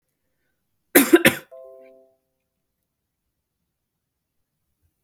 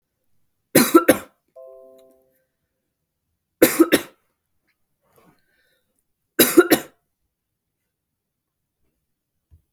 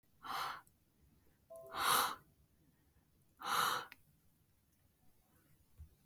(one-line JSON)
{"cough_length": "5.0 s", "cough_amplitude": 32768, "cough_signal_mean_std_ratio": 0.18, "three_cough_length": "9.7 s", "three_cough_amplitude": 32768, "three_cough_signal_mean_std_ratio": 0.22, "exhalation_length": "6.1 s", "exhalation_amplitude": 3299, "exhalation_signal_mean_std_ratio": 0.37, "survey_phase": "beta (2021-08-13 to 2022-03-07)", "age": "18-44", "gender": "Female", "wearing_mask": "No", "symptom_none": true, "smoker_status": "Never smoked", "respiratory_condition_asthma": false, "respiratory_condition_other": false, "recruitment_source": "REACT", "submission_delay": "2 days", "covid_test_result": "Negative", "covid_test_method": "RT-qPCR", "influenza_a_test_result": "Negative", "influenza_b_test_result": "Negative"}